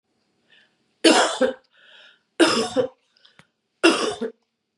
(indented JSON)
{
  "three_cough_length": "4.8 s",
  "three_cough_amplitude": 28181,
  "three_cough_signal_mean_std_ratio": 0.39,
  "survey_phase": "beta (2021-08-13 to 2022-03-07)",
  "age": "45-64",
  "gender": "Female",
  "wearing_mask": "No",
  "symptom_change_to_sense_of_smell_or_taste": true,
  "symptom_loss_of_taste": true,
  "symptom_onset": "4 days",
  "smoker_status": "Never smoked",
  "respiratory_condition_asthma": false,
  "respiratory_condition_other": false,
  "recruitment_source": "Test and Trace",
  "submission_delay": "2 days",
  "covid_test_result": "Positive",
  "covid_test_method": "RT-qPCR",
  "covid_ct_value": 18.6,
  "covid_ct_gene": "ORF1ab gene",
  "covid_ct_mean": 19.7,
  "covid_viral_load": "350000 copies/ml",
  "covid_viral_load_category": "Low viral load (10K-1M copies/ml)"
}